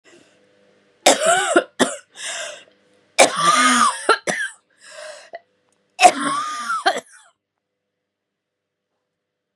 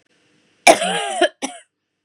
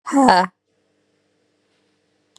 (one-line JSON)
{"three_cough_length": "9.6 s", "three_cough_amplitude": 32768, "three_cough_signal_mean_std_ratio": 0.4, "cough_length": "2.0 s", "cough_amplitude": 32768, "cough_signal_mean_std_ratio": 0.36, "exhalation_length": "2.4 s", "exhalation_amplitude": 32767, "exhalation_signal_mean_std_ratio": 0.3, "survey_phase": "beta (2021-08-13 to 2022-03-07)", "age": "18-44", "gender": "Female", "wearing_mask": "No", "symptom_cough_any": true, "symptom_new_continuous_cough": true, "symptom_runny_or_blocked_nose": true, "symptom_shortness_of_breath": true, "symptom_sore_throat": true, "symptom_fatigue": true, "symptom_fever_high_temperature": true, "symptom_headache": true, "symptom_change_to_sense_of_smell_or_taste": true, "symptom_loss_of_taste": true, "symptom_other": true, "symptom_onset": "2 days", "smoker_status": "Ex-smoker", "respiratory_condition_asthma": false, "respiratory_condition_other": false, "recruitment_source": "Test and Trace", "submission_delay": "1 day", "covid_test_result": "Positive", "covid_test_method": "ePCR"}